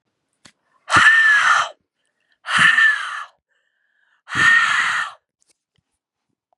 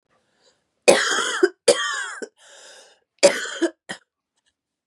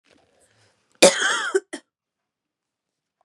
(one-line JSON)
{"exhalation_length": "6.6 s", "exhalation_amplitude": 29630, "exhalation_signal_mean_std_ratio": 0.49, "three_cough_length": "4.9 s", "three_cough_amplitude": 32768, "three_cough_signal_mean_std_ratio": 0.36, "cough_length": "3.2 s", "cough_amplitude": 32768, "cough_signal_mean_std_ratio": 0.27, "survey_phase": "beta (2021-08-13 to 2022-03-07)", "age": "18-44", "gender": "Female", "wearing_mask": "No", "symptom_cough_any": true, "symptom_new_continuous_cough": true, "symptom_runny_or_blocked_nose": true, "symptom_sore_throat": true, "symptom_fatigue": true, "symptom_headache": true, "symptom_other": true, "symptom_onset": "4 days", "smoker_status": "Ex-smoker", "respiratory_condition_asthma": false, "respiratory_condition_other": false, "recruitment_source": "Test and Trace", "submission_delay": "3 days", "covid_test_result": "Positive", "covid_test_method": "RT-qPCR", "covid_ct_value": 16.5, "covid_ct_gene": "ORF1ab gene", "covid_ct_mean": 16.9, "covid_viral_load": "2900000 copies/ml", "covid_viral_load_category": "High viral load (>1M copies/ml)"}